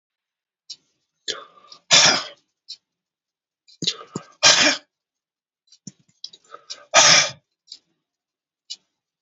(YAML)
exhalation_length: 9.2 s
exhalation_amplitude: 32768
exhalation_signal_mean_std_ratio: 0.28
survey_phase: beta (2021-08-13 to 2022-03-07)
age: 65+
gender: Male
wearing_mask: 'No'
symptom_cough_any: true
symptom_onset: 5 days
smoker_status: Current smoker (1 to 10 cigarettes per day)
respiratory_condition_asthma: false
respiratory_condition_other: true
recruitment_source: REACT
submission_delay: 2 days
covid_test_result: Negative
covid_test_method: RT-qPCR
influenza_a_test_result: Negative
influenza_b_test_result: Negative